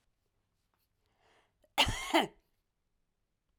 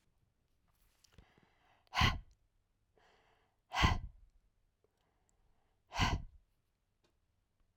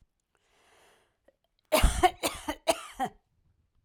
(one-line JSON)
{"cough_length": "3.6 s", "cough_amplitude": 7705, "cough_signal_mean_std_ratio": 0.25, "exhalation_length": "7.8 s", "exhalation_amplitude": 5250, "exhalation_signal_mean_std_ratio": 0.26, "three_cough_length": "3.8 s", "three_cough_amplitude": 10499, "three_cough_signal_mean_std_ratio": 0.31, "survey_phase": "beta (2021-08-13 to 2022-03-07)", "age": "45-64", "gender": "Female", "wearing_mask": "No", "symptom_cough_any": true, "symptom_runny_or_blocked_nose": true, "symptom_sore_throat": true, "symptom_fatigue": true, "symptom_headache": true, "symptom_onset": "10 days", "smoker_status": "Ex-smoker", "respiratory_condition_asthma": true, "respiratory_condition_other": false, "recruitment_source": "REACT", "submission_delay": "1 day", "covid_test_result": "Positive", "covid_test_method": "RT-qPCR", "covid_ct_value": 34.2, "covid_ct_gene": "N gene", "influenza_a_test_result": "Negative", "influenza_b_test_result": "Negative"}